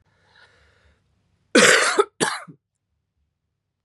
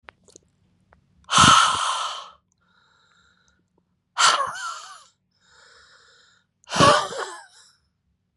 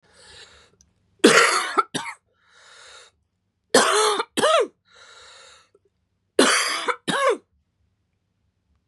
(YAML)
cough_length: 3.8 s
cough_amplitude: 31127
cough_signal_mean_std_ratio: 0.3
exhalation_length: 8.4 s
exhalation_amplitude: 28533
exhalation_signal_mean_std_ratio: 0.34
three_cough_length: 8.9 s
three_cough_amplitude: 32194
three_cough_signal_mean_std_ratio: 0.39
survey_phase: beta (2021-08-13 to 2022-03-07)
age: 18-44
gender: Female
wearing_mask: 'No'
symptom_fatigue: true
symptom_onset: 12 days
smoker_status: Never smoked
respiratory_condition_asthma: true
respiratory_condition_other: false
recruitment_source: REACT
submission_delay: 1 day
covid_test_result: Negative
covid_test_method: RT-qPCR
influenza_a_test_result: Negative
influenza_b_test_result: Negative